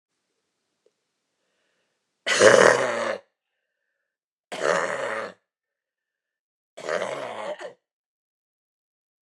{
  "three_cough_length": "9.2 s",
  "three_cough_amplitude": 31942,
  "three_cough_signal_mean_std_ratio": 0.3,
  "survey_phase": "beta (2021-08-13 to 2022-03-07)",
  "age": "65+",
  "gender": "Female",
  "wearing_mask": "Yes",
  "symptom_new_continuous_cough": true,
  "symptom_shortness_of_breath": true,
  "symptom_abdominal_pain": true,
  "symptom_headache": true,
  "symptom_change_to_sense_of_smell_or_taste": true,
  "symptom_onset": "5 days",
  "smoker_status": "Never smoked",
  "respiratory_condition_asthma": false,
  "respiratory_condition_other": false,
  "recruitment_source": "Test and Trace",
  "submission_delay": "2 days",
  "covid_test_result": "Positive",
  "covid_test_method": "RT-qPCR",
  "covid_ct_value": 19.8,
  "covid_ct_gene": "ORF1ab gene"
}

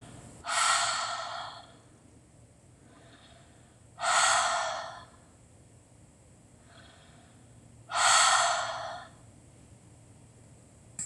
{
  "exhalation_length": "11.1 s",
  "exhalation_amplitude": 10961,
  "exhalation_signal_mean_std_ratio": 0.45,
  "survey_phase": "beta (2021-08-13 to 2022-03-07)",
  "age": "45-64",
  "gender": "Female",
  "wearing_mask": "No",
  "symptom_none": true,
  "smoker_status": "Ex-smoker",
  "respiratory_condition_asthma": false,
  "respiratory_condition_other": false,
  "recruitment_source": "REACT",
  "submission_delay": "2 days",
  "covid_test_result": "Negative",
  "covid_test_method": "RT-qPCR",
  "influenza_a_test_result": "Negative",
  "influenza_b_test_result": "Negative"
}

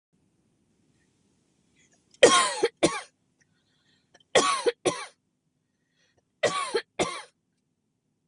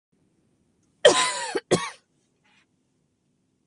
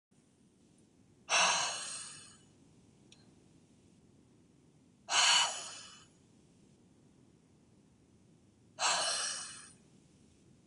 {
  "three_cough_length": "8.3 s",
  "three_cough_amplitude": 23428,
  "three_cough_signal_mean_std_ratio": 0.3,
  "cough_length": "3.7 s",
  "cough_amplitude": 27629,
  "cough_signal_mean_std_ratio": 0.27,
  "exhalation_length": "10.7 s",
  "exhalation_amplitude": 5825,
  "exhalation_signal_mean_std_ratio": 0.36,
  "survey_phase": "beta (2021-08-13 to 2022-03-07)",
  "age": "18-44",
  "gender": "Female",
  "wearing_mask": "No",
  "symptom_sore_throat": true,
  "symptom_onset": "5 days",
  "smoker_status": "Never smoked",
  "respiratory_condition_asthma": false,
  "respiratory_condition_other": false,
  "recruitment_source": "REACT",
  "submission_delay": "1 day",
  "covid_test_result": "Negative",
  "covid_test_method": "RT-qPCR",
  "influenza_a_test_result": "Negative",
  "influenza_b_test_result": "Negative"
}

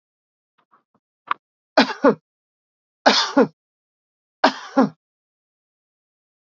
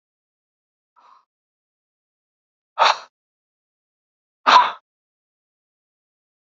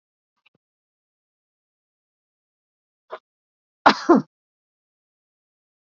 {
  "three_cough_length": "6.6 s",
  "three_cough_amplitude": 29121,
  "three_cough_signal_mean_std_ratio": 0.26,
  "exhalation_length": "6.5 s",
  "exhalation_amplitude": 32767,
  "exhalation_signal_mean_std_ratio": 0.19,
  "cough_length": "6.0 s",
  "cough_amplitude": 28298,
  "cough_signal_mean_std_ratio": 0.15,
  "survey_phase": "alpha (2021-03-01 to 2021-08-12)",
  "age": "65+",
  "gender": "Male",
  "wearing_mask": "No",
  "symptom_none": true,
  "smoker_status": "Never smoked",
  "respiratory_condition_asthma": false,
  "respiratory_condition_other": false,
  "recruitment_source": "REACT",
  "submission_delay": "1 day",
  "covid_test_result": "Negative",
  "covid_test_method": "RT-qPCR"
}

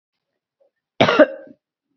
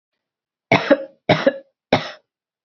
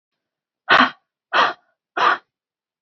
{
  "cough_length": "2.0 s",
  "cough_amplitude": 29215,
  "cough_signal_mean_std_ratio": 0.28,
  "three_cough_length": "2.6 s",
  "three_cough_amplitude": 32768,
  "three_cough_signal_mean_std_ratio": 0.33,
  "exhalation_length": "2.8 s",
  "exhalation_amplitude": 28185,
  "exhalation_signal_mean_std_ratio": 0.35,
  "survey_phase": "beta (2021-08-13 to 2022-03-07)",
  "age": "45-64",
  "gender": "Female",
  "wearing_mask": "No",
  "symptom_runny_or_blocked_nose": true,
  "smoker_status": "Never smoked",
  "respiratory_condition_asthma": false,
  "respiratory_condition_other": false,
  "recruitment_source": "REACT",
  "submission_delay": "1 day",
  "covid_test_result": "Negative",
  "covid_test_method": "RT-qPCR"
}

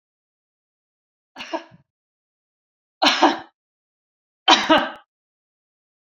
{
  "three_cough_length": "6.1 s",
  "three_cough_amplitude": 30984,
  "three_cough_signal_mean_std_ratio": 0.26,
  "survey_phase": "beta (2021-08-13 to 2022-03-07)",
  "age": "45-64",
  "gender": "Female",
  "wearing_mask": "No",
  "symptom_none": true,
  "smoker_status": "Never smoked",
  "respiratory_condition_asthma": false,
  "respiratory_condition_other": false,
  "recruitment_source": "Test and Trace",
  "submission_delay": "0 days",
  "covid_test_result": "Negative",
  "covid_test_method": "LFT"
}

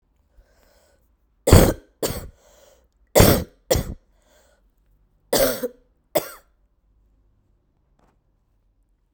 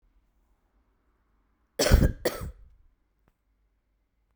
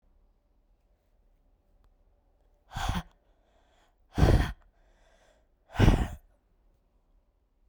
{
  "three_cough_length": "9.1 s",
  "three_cough_amplitude": 32768,
  "three_cough_signal_mean_std_ratio": 0.26,
  "cough_length": "4.4 s",
  "cough_amplitude": 21887,
  "cough_signal_mean_std_ratio": 0.24,
  "exhalation_length": "7.7 s",
  "exhalation_amplitude": 17408,
  "exhalation_signal_mean_std_ratio": 0.26,
  "survey_phase": "alpha (2021-03-01 to 2021-08-12)",
  "age": "18-44",
  "gender": "Male",
  "wearing_mask": "No",
  "symptom_cough_any": true,
  "symptom_fatigue": true,
  "symptom_fever_high_temperature": true,
  "symptom_headache": true,
  "symptom_change_to_sense_of_smell_or_taste": true,
  "symptom_loss_of_taste": true,
  "symptom_onset": "9 days",
  "smoker_status": "Current smoker (1 to 10 cigarettes per day)",
  "respiratory_condition_asthma": true,
  "respiratory_condition_other": false,
  "recruitment_source": "Test and Trace",
  "submission_delay": "8 days",
  "covid_test_result": "Positive",
  "covid_test_method": "RT-qPCR"
}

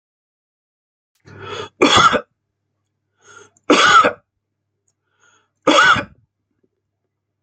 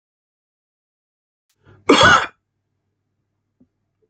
{
  "three_cough_length": "7.4 s",
  "three_cough_amplitude": 31139,
  "three_cough_signal_mean_std_ratio": 0.33,
  "cough_length": "4.1 s",
  "cough_amplitude": 30185,
  "cough_signal_mean_std_ratio": 0.24,
  "survey_phase": "beta (2021-08-13 to 2022-03-07)",
  "age": "45-64",
  "gender": "Male",
  "wearing_mask": "No",
  "symptom_runny_or_blocked_nose": true,
  "symptom_onset": "8 days",
  "smoker_status": "Never smoked",
  "respiratory_condition_asthma": false,
  "respiratory_condition_other": false,
  "recruitment_source": "REACT",
  "submission_delay": "1 day",
  "covid_test_result": "Negative",
  "covid_test_method": "RT-qPCR"
}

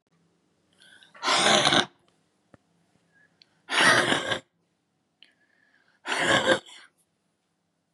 {
  "exhalation_length": "7.9 s",
  "exhalation_amplitude": 23301,
  "exhalation_signal_mean_std_ratio": 0.37,
  "survey_phase": "beta (2021-08-13 to 2022-03-07)",
  "age": "45-64",
  "gender": "Female",
  "wearing_mask": "No",
  "symptom_cough_any": true,
  "symptom_sore_throat": true,
  "symptom_onset": "5 days",
  "smoker_status": "Never smoked",
  "respiratory_condition_asthma": true,
  "respiratory_condition_other": false,
  "recruitment_source": "Test and Trace",
  "submission_delay": "3 days",
  "covid_test_result": "Negative",
  "covid_test_method": "RT-qPCR"
}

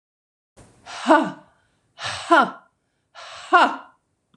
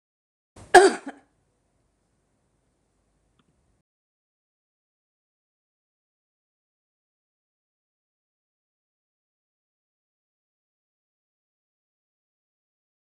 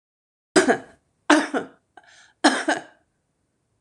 {
  "exhalation_length": "4.4 s",
  "exhalation_amplitude": 25797,
  "exhalation_signal_mean_std_ratio": 0.33,
  "cough_length": "13.0 s",
  "cough_amplitude": 26028,
  "cough_signal_mean_std_ratio": 0.09,
  "three_cough_length": "3.8 s",
  "three_cough_amplitude": 25471,
  "three_cough_signal_mean_std_ratio": 0.33,
  "survey_phase": "beta (2021-08-13 to 2022-03-07)",
  "age": "65+",
  "gender": "Female",
  "wearing_mask": "No",
  "symptom_none": true,
  "smoker_status": "Current smoker (11 or more cigarettes per day)",
  "respiratory_condition_asthma": false,
  "respiratory_condition_other": true,
  "recruitment_source": "REACT",
  "submission_delay": "3 days",
  "covid_test_result": "Negative",
  "covid_test_method": "RT-qPCR"
}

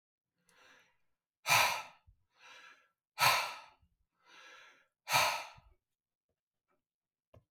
{
  "exhalation_length": "7.5 s",
  "exhalation_amplitude": 6205,
  "exhalation_signal_mean_std_ratio": 0.29,
  "survey_phase": "beta (2021-08-13 to 2022-03-07)",
  "age": "45-64",
  "gender": "Male",
  "wearing_mask": "No",
  "symptom_headache": true,
  "symptom_other": true,
  "symptom_onset": "6 days",
  "smoker_status": "Ex-smoker",
  "respiratory_condition_asthma": false,
  "respiratory_condition_other": false,
  "recruitment_source": "REACT",
  "submission_delay": "2 days",
  "covid_test_result": "Negative",
  "covid_test_method": "RT-qPCR",
  "influenza_a_test_result": "Negative",
  "influenza_b_test_result": "Negative"
}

